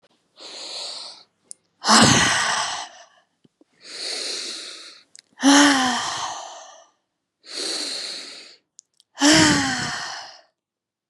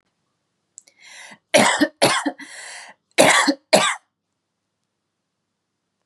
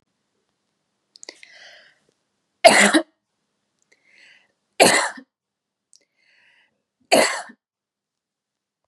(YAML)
exhalation_length: 11.1 s
exhalation_amplitude: 29383
exhalation_signal_mean_std_ratio: 0.46
cough_length: 6.1 s
cough_amplitude: 32768
cough_signal_mean_std_ratio: 0.35
three_cough_length: 8.9 s
three_cough_amplitude: 32767
three_cough_signal_mean_std_ratio: 0.24
survey_phase: beta (2021-08-13 to 2022-03-07)
age: 18-44
gender: Female
wearing_mask: 'No'
symptom_none: true
smoker_status: Ex-smoker
respiratory_condition_asthma: false
respiratory_condition_other: false
recruitment_source: REACT
submission_delay: 1 day
covid_test_result: Negative
covid_test_method: RT-qPCR